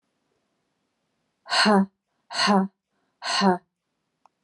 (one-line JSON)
{"exhalation_length": "4.4 s", "exhalation_amplitude": 17682, "exhalation_signal_mean_std_ratio": 0.38, "survey_phase": "alpha (2021-03-01 to 2021-08-12)", "age": "45-64", "gender": "Female", "wearing_mask": "No", "symptom_cough_any": true, "symptom_fatigue": true, "symptom_onset": "12 days", "smoker_status": "Never smoked", "respiratory_condition_asthma": false, "respiratory_condition_other": false, "recruitment_source": "REACT", "submission_delay": "1 day", "covid_test_result": "Negative", "covid_test_method": "RT-qPCR"}